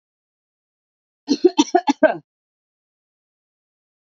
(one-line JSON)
{"three_cough_length": "4.1 s", "three_cough_amplitude": 31496, "three_cough_signal_mean_std_ratio": 0.23, "survey_phase": "beta (2021-08-13 to 2022-03-07)", "age": "18-44", "gender": "Female", "wearing_mask": "No", "symptom_none": true, "smoker_status": "Ex-smoker", "respiratory_condition_asthma": false, "respiratory_condition_other": false, "recruitment_source": "REACT", "submission_delay": "-14 days", "covid_test_result": "Negative", "covid_test_method": "RT-qPCR", "influenza_a_test_result": "Unknown/Void", "influenza_b_test_result": "Unknown/Void"}